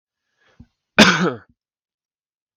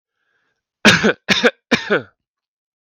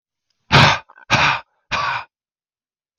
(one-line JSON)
{"cough_length": "2.6 s", "cough_amplitude": 32768, "cough_signal_mean_std_ratio": 0.26, "three_cough_length": "2.8 s", "three_cough_amplitude": 32768, "three_cough_signal_mean_std_ratio": 0.37, "exhalation_length": "3.0 s", "exhalation_amplitude": 32768, "exhalation_signal_mean_std_ratio": 0.39, "survey_phase": "beta (2021-08-13 to 2022-03-07)", "age": "18-44", "gender": "Male", "wearing_mask": "No", "symptom_none": true, "symptom_onset": "6 days", "smoker_status": "Never smoked", "respiratory_condition_asthma": false, "respiratory_condition_other": false, "recruitment_source": "REACT", "submission_delay": "3 days", "covid_test_result": "Negative", "covid_test_method": "RT-qPCR"}